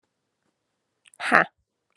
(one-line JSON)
{"exhalation_length": "2.0 s", "exhalation_amplitude": 32763, "exhalation_signal_mean_std_ratio": 0.21, "survey_phase": "alpha (2021-03-01 to 2021-08-12)", "age": "18-44", "gender": "Female", "wearing_mask": "No", "symptom_none": true, "symptom_onset": "7 days", "smoker_status": "Never smoked", "respiratory_condition_asthma": true, "respiratory_condition_other": false, "recruitment_source": "Test and Trace", "submission_delay": "2 days", "covid_test_result": "Positive", "covid_test_method": "RT-qPCR", "covid_ct_value": 20.5, "covid_ct_gene": "ORF1ab gene", "covid_ct_mean": 21.1, "covid_viral_load": "120000 copies/ml", "covid_viral_load_category": "Low viral load (10K-1M copies/ml)"}